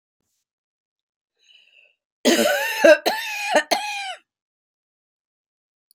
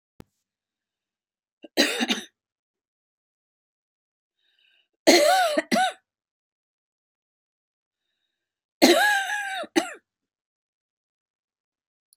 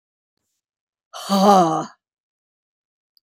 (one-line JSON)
{"cough_length": "5.9 s", "cough_amplitude": 29016, "cough_signal_mean_std_ratio": 0.35, "three_cough_length": "12.2 s", "three_cough_amplitude": 27461, "three_cough_signal_mean_std_ratio": 0.3, "exhalation_length": "3.3 s", "exhalation_amplitude": 27441, "exhalation_signal_mean_std_ratio": 0.33, "survey_phase": "beta (2021-08-13 to 2022-03-07)", "age": "65+", "gender": "Female", "wearing_mask": "No", "symptom_none": true, "symptom_onset": "12 days", "smoker_status": "Never smoked", "respiratory_condition_asthma": false, "respiratory_condition_other": false, "recruitment_source": "REACT", "submission_delay": "5 days", "covid_test_result": "Negative", "covid_test_method": "RT-qPCR", "influenza_a_test_result": "Negative", "influenza_b_test_result": "Negative"}